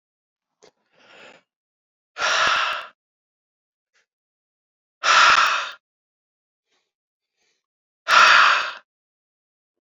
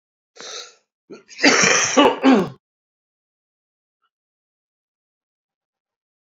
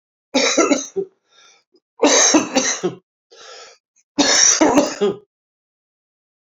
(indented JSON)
{
  "exhalation_length": "10.0 s",
  "exhalation_amplitude": 28345,
  "exhalation_signal_mean_std_ratio": 0.33,
  "cough_length": "6.4 s",
  "cough_amplitude": 30058,
  "cough_signal_mean_std_ratio": 0.32,
  "three_cough_length": "6.5 s",
  "three_cough_amplitude": 29056,
  "three_cough_signal_mean_std_ratio": 0.48,
  "survey_phase": "beta (2021-08-13 to 2022-03-07)",
  "age": "45-64",
  "gender": "Male",
  "wearing_mask": "No",
  "symptom_cough_any": true,
  "symptom_new_continuous_cough": true,
  "symptom_abdominal_pain": true,
  "symptom_fatigue": true,
  "symptom_headache": true,
  "symptom_onset": "2 days",
  "smoker_status": "Ex-smoker",
  "respiratory_condition_asthma": false,
  "respiratory_condition_other": false,
  "recruitment_source": "Test and Trace",
  "submission_delay": "2 days",
  "covid_test_result": "Positive",
  "covid_test_method": "RT-qPCR"
}